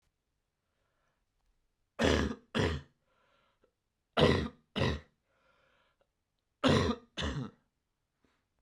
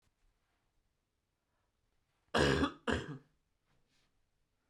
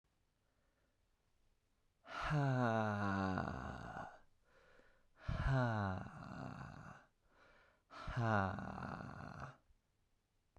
{"three_cough_length": "8.6 s", "three_cough_amplitude": 7921, "three_cough_signal_mean_std_ratio": 0.34, "cough_length": "4.7 s", "cough_amplitude": 5074, "cough_signal_mean_std_ratio": 0.27, "exhalation_length": "10.6 s", "exhalation_amplitude": 2075, "exhalation_signal_mean_std_ratio": 0.52, "survey_phase": "beta (2021-08-13 to 2022-03-07)", "age": "18-44", "gender": "Male", "wearing_mask": "No", "symptom_cough_any": true, "symptom_new_continuous_cough": true, "symptom_fatigue": true, "symptom_fever_high_temperature": true, "symptom_change_to_sense_of_smell_or_taste": true, "symptom_loss_of_taste": true, "symptom_other": true, "symptom_onset": "4 days", "smoker_status": "Never smoked", "respiratory_condition_asthma": true, "respiratory_condition_other": false, "recruitment_source": "Test and Trace", "submission_delay": "2 days", "covid_test_result": "Positive", "covid_test_method": "RT-qPCR", "covid_ct_value": 13.1, "covid_ct_gene": "ORF1ab gene", "covid_ct_mean": 13.4, "covid_viral_load": "41000000 copies/ml", "covid_viral_load_category": "High viral load (>1M copies/ml)"}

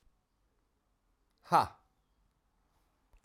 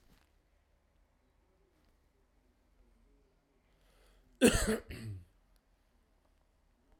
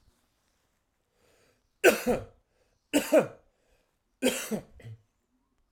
{"exhalation_length": "3.2 s", "exhalation_amplitude": 8441, "exhalation_signal_mean_std_ratio": 0.17, "cough_length": "7.0 s", "cough_amplitude": 8461, "cough_signal_mean_std_ratio": 0.2, "three_cough_length": "5.7 s", "three_cough_amplitude": 13649, "three_cough_signal_mean_std_ratio": 0.29, "survey_phase": "beta (2021-08-13 to 2022-03-07)", "age": "45-64", "gender": "Male", "wearing_mask": "No", "symptom_cough_any": true, "symptom_shortness_of_breath": true, "symptom_sore_throat": true, "symptom_fatigue": true, "symptom_fever_high_temperature": true, "symptom_headache": true, "smoker_status": "Ex-smoker", "respiratory_condition_asthma": false, "respiratory_condition_other": false, "recruitment_source": "Test and Trace", "submission_delay": "1 day", "covid_test_result": "Positive", "covid_test_method": "RT-qPCR"}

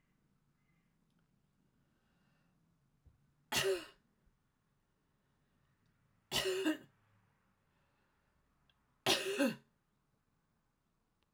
{"three_cough_length": "11.3 s", "three_cough_amplitude": 4328, "three_cough_signal_mean_std_ratio": 0.27, "survey_phase": "alpha (2021-03-01 to 2021-08-12)", "age": "45-64", "gender": "Female", "wearing_mask": "No", "symptom_none": true, "smoker_status": "Current smoker (e-cigarettes or vapes only)", "respiratory_condition_asthma": false, "respiratory_condition_other": false, "recruitment_source": "REACT", "submission_delay": "1 day", "covid_test_result": "Negative", "covid_test_method": "RT-qPCR"}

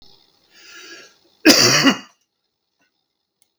{"cough_length": "3.6 s", "cough_amplitude": 32768, "cough_signal_mean_std_ratio": 0.31, "survey_phase": "beta (2021-08-13 to 2022-03-07)", "age": "65+", "gender": "Male", "wearing_mask": "No", "symptom_none": true, "smoker_status": "Ex-smoker", "respiratory_condition_asthma": false, "respiratory_condition_other": true, "recruitment_source": "REACT", "submission_delay": "3 days", "covid_test_result": "Negative", "covid_test_method": "RT-qPCR", "influenza_a_test_result": "Negative", "influenza_b_test_result": "Negative"}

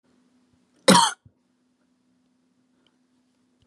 {"cough_length": "3.7 s", "cough_amplitude": 31355, "cough_signal_mean_std_ratio": 0.2, "survey_phase": "beta (2021-08-13 to 2022-03-07)", "age": "18-44", "gender": "Female", "wearing_mask": "No", "symptom_cough_any": true, "smoker_status": "Never smoked", "respiratory_condition_asthma": false, "respiratory_condition_other": false, "recruitment_source": "REACT", "submission_delay": "1 day", "covid_test_result": "Negative", "covid_test_method": "RT-qPCR", "influenza_a_test_result": "Negative", "influenza_b_test_result": "Negative"}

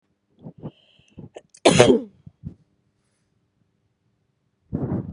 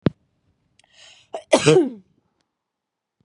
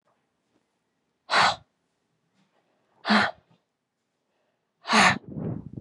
{"cough_length": "5.1 s", "cough_amplitude": 32768, "cough_signal_mean_std_ratio": 0.26, "three_cough_length": "3.2 s", "three_cough_amplitude": 26971, "three_cough_signal_mean_std_ratio": 0.27, "exhalation_length": "5.8 s", "exhalation_amplitude": 17010, "exhalation_signal_mean_std_ratio": 0.32, "survey_phase": "beta (2021-08-13 to 2022-03-07)", "age": "45-64", "gender": "Female", "wearing_mask": "No", "symptom_cough_any": true, "symptom_runny_or_blocked_nose": true, "symptom_shortness_of_breath": true, "symptom_sore_throat": true, "symptom_abdominal_pain": true, "symptom_diarrhoea": true, "symptom_fatigue": true, "symptom_fever_high_temperature": true, "symptom_headache": true, "symptom_change_to_sense_of_smell_or_taste": true, "symptom_loss_of_taste": true, "smoker_status": "Never smoked", "respiratory_condition_asthma": false, "respiratory_condition_other": false, "recruitment_source": "Test and Trace", "submission_delay": "1 day", "covid_test_result": "Positive", "covid_test_method": "LFT"}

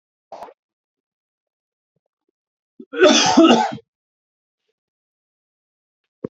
{"cough_length": "6.3 s", "cough_amplitude": 28104, "cough_signal_mean_std_ratio": 0.27, "survey_phase": "alpha (2021-03-01 to 2021-08-12)", "age": "18-44", "gender": "Male", "wearing_mask": "No", "symptom_diarrhoea": true, "symptom_fatigue": true, "symptom_headache": true, "symptom_change_to_sense_of_smell_or_taste": true, "symptom_loss_of_taste": true, "smoker_status": "Never smoked", "respiratory_condition_asthma": false, "respiratory_condition_other": false, "recruitment_source": "Test and Trace", "submission_delay": "2 days", "covid_test_result": "Positive", "covid_test_method": "RT-qPCR"}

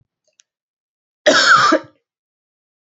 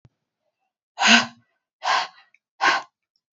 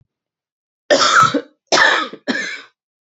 {"cough_length": "3.0 s", "cough_amplitude": 30005, "cough_signal_mean_std_ratio": 0.36, "exhalation_length": "3.3 s", "exhalation_amplitude": 30231, "exhalation_signal_mean_std_ratio": 0.34, "three_cough_length": "3.1 s", "three_cough_amplitude": 32035, "three_cough_signal_mean_std_ratio": 0.48, "survey_phase": "beta (2021-08-13 to 2022-03-07)", "age": "45-64", "gender": "Female", "wearing_mask": "No", "symptom_cough_any": true, "symptom_runny_or_blocked_nose": true, "symptom_sore_throat": true, "smoker_status": "Never smoked", "respiratory_condition_asthma": false, "respiratory_condition_other": false, "recruitment_source": "Test and Trace", "submission_delay": "2 days", "covid_test_result": "Positive", "covid_test_method": "ePCR"}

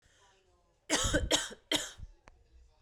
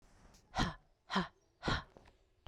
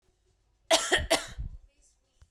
{"three_cough_length": "2.8 s", "three_cough_amplitude": 8558, "three_cough_signal_mean_std_ratio": 0.42, "exhalation_length": "2.5 s", "exhalation_amplitude": 3913, "exhalation_signal_mean_std_ratio": 0.39, "cough_length": "2.3 s", "cough_amplitude": 13138, "cough_signal_mean_std_ratio": 0.37, "survey_phase": "beta (2021-08-13 to 2022-03-07)", "age": "18-44", "gender": "Female", "wearing_mask": "No", "symptom_cough_any": true, "symptom_new_continuous_cough": true, "symptom_runny_or_blocked_nose": true, "symptom_shortness_of_breath": true, "symptom_sore_throat": true, "symptom_fatigue": true, "symptom_fever_high_temperature": true, "symptom_headache": true, "symptom_change_to_sense_of_smell_or_taste": true, "symptom_onset": "2 days", "smoker_status": "Ex-smoker", "respiratory_condition_asthma": false, "respiratory_condition_other": false, "recruitment_source": "Test and Trace", "submission_delay": "2 days", "covid_test_result": "Positive", "covid_test_method": "RT-qPCR", "covid_ct_value": 20.1, "covid_ct_gene": "N gene", "covid_ct_mean": 20.7, "covid_viral_load": "160000 copies/ml", "covid_viral_load_category": "Low viral load (10K-1M copies/ml)"}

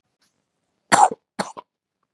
{"cough_length": "2.1 s", "cough_amplitude": 31275, "cough_signal_mean_std_ratio": 0.24, "survey_phase": "beta (2021-08-13 to 2022-03-07)", "age": "45-64", "gender": "Male", "wearing_mask": "No", "symptom_none": true, "smoker_status": "Never smoked", "respiratory_condition_asthma": false, "respiratory_condition_other": false, "recruitment_source": "REACT", "submission_delay": "1 day", "covid_test_result": "Negative", "covid_test_method": "RT-qPCR", "influenza_a_test_result": "Negative", "influenza_b_test_result": "Negative"}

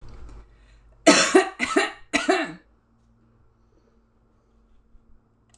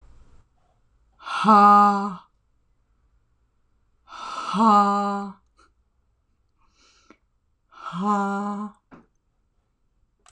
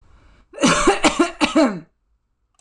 {"three_cough_length": "5.6 s", "three_cough_amplitude": 25590, "three_cough_signal_mean_std_ratio": 0.32, "exhalation_length": "10.3 s", "exhalation_amplitude": 23242, "exhalation_signal_mean_std_ratio": 0.37, "cough_length": "2.6 s", "cough_amplitude": 24107, "cough_signal_mean_std_ratio": 0.5, "survey_phase": "beta (2021-08-13 to 2022-03-07)", "age": "18-44", "gender": "Female", "wearing_mask": "No", "symptom_none": true, "smoker_status": "Never smoked", "respiratory_condition_asthma": false, "respiratory_condition_other": false, "recruitment_source": "REACT", "submission_delay": "2 days", "covid_test_result": "Negative", "covid_test_method": "RT-qPCR"}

